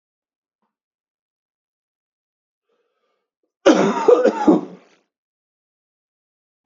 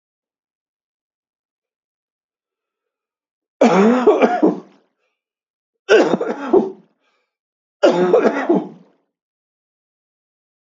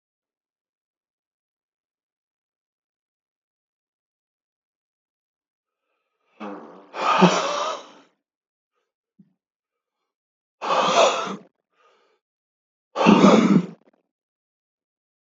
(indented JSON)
{
  "cough_length": "6.7 s",
  "cough_amplitude": 27754,
  "cough_signal_mean_std_ratio": 0.27,
  "three_cough_length": "10.7 s",
  "three_cough_amplitude": 30318,
  "three_cough_signal_mean_std_ratio": 0.37,
  "exhalation_length": "15.3 s",
  "exhalation_amplitude": 27921,
  "exhalation_signal_mean_std_ratio": 0.28,
  "survey_phase": "beta (2021-08-13 to 2022-03-07)",
  "age": "65+",
  "gender": "Male",
  "wearing_mask": "No",
  "symptom_runny_or_blocked_nose": true,
  "smoker_status": "Never smoked",
  "respiratory_condition_asthma": false,
  "respiratory_condition_other": false,
  "recruitment_source": "Test and Trace",
  "submission_delay": "2 days",
  "covid_test_result": "Positive",
  "covid_test_method": "RT-qPCR",
  "covid_ct_value": 24.5,
  "covid_ct_gene": "ORF1ab gene",
  "covid_ct_mean": 24.8,
  "covid_viral_load": "7100 copies/ml",
  "covid_viral_load_category": "Minimal viral load (< 10K copies/ml)"
}